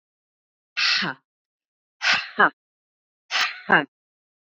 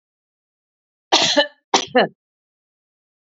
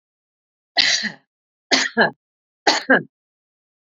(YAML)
exhalation_length: 4.5 s
exhalation_amplitude: 28092
exhalation_signal_mean_std_ratio: 0.35
cough_length: 3.2 s
cough_amplitude: 32767
cough_signal_mean_std_ratio: 0.31
three_cough_length: 3.8 s
three_cough_amplitude: 32767
three_cough_signal_mean_std_ratio: 0.36
survey_phase: beta (2021-08-13 to 2022-03-07)
age: 45-64
gender: Female
wearing_mask: 'No'
symptom_none: true
smoker_status: Prefer not to say
respiratory_condition_asthma: false
respiratory_condition_other: false
recruitment_source: REACT
submission_delay: 3 days
covid_test_result: Positive
covid_test_method: RT-qPCR
covid_ct_value: 22.0
covid_ct_gene: E gene
influenza_a_test_result: Negative
influenza_b_test_result: Negative